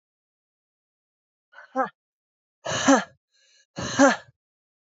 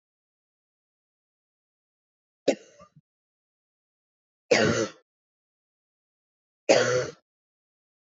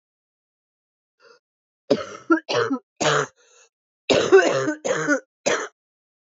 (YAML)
exhalation_length: 4.9 s
exhalation_amplitude: 20637
exhalation_signal_mean_std_ratio: 0.27
three_cough_length: 8.1 s
three_cough_amplitude: 20487
three_cough_signal_mean_std_ratio: 0.24
cough_length: 6.4 s
cough_amplitude: 23400
cough_signal_mean_std_ratio: 0.41
survey_phase: beta (2021-08-13 to 2022-03-07)
age: 45-64
gender: Female
wearing_mask: 'No'
symptom_cough_any: true
symptom_runny_or_blocked_nose: true
symptom_abdominal_pain: true
symptom_diarrhoea: true
symptom_fatigue: true
symptom_fever_high_temperature: true
symptom_headache: true
symptom_change_to_sense_of_smell_or_taste: true
symptom_other: true
symptom_onset: 2 days
smoker_status: Never smoked
respiratory_condition_asthma: false
respiratory_condition_other: false
recruitment_source: Test and Trace
submission_delay: 1 day
covid_test_result: Positive
covid_test_method: RT-qPCR
covid_ct_value: 18.0
covid_ct_gene: ORF1ab gene
covid_ct_mean: 18.7
covid_viral_load: 740000 copies/ml
covid_viral_load_category: Low viral load (10K-1M copies/ml)